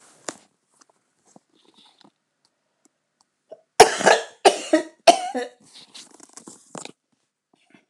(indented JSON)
{
  "cough_length": "7.9 s",
  "cough_amplitude": 29204,
  "cough_signal_mean_std_ratio": 0.22,
  "survey_phase": "alpha (2021-03-01 to 2021-08-12)",
  "age": "65+",
  "gender": "Female",
  "wearing_mask": "No",
  "symptom_none": true,
  "smoker_status": "Ex-smoker",
  "respiratory_condition_asthma": false,
  "respiratory_condition_other": true,
  "recruitment_source": "REACT",
  "submission_delay": "4 days",
  "covid_test_result": "Negative",
  "covid_test_method": "RT-qPCR"
}